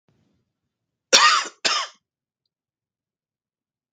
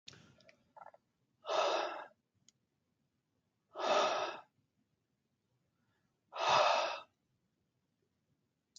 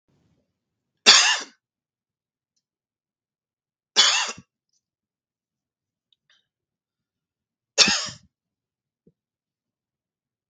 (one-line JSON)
{"cough_length": "3.9 s", "cough_amplitude": 32768, "cough_signal_mean_std_ratio": 0.27, "exhalation_length": "8.8 s", "exhalation_amplitude": 4608, "exhalation_signal_mean_std_ratio": 0.35, "three_cough_length": "10.5 s", "three_cough_amplitude": 32768, "three_cough_signal_mean_std_ratio": 0.21, "survey_phase": "beta (2021-08-13 to 2022-03-07)", "age": "45-64", "gender": "Male", "wearing_mask": "No", "symptom_runny_or_blocked_nose": true, "symptom_sore_throat": true, "symptom_fatigue": true, "symptom_headache": true, "smoker_status": "Never smoked", "respiratory_condition_asthma": false, "respiratory_condition_other": false, "recruitment_source": "Test and Trace", "submission_delay": "2 days", "covid_test_result": "Positive", "covid_test_method": "RT-qPCR", "covid_ct_value": 25.7, "covid_ct_gene": "ORF1ab gene", "covid_ct_mean": 26.6, "covid_viral_load": "1900 copies/ml", "covid_viral_load_category": "Minimal viral load (< 10K copies/ml)"}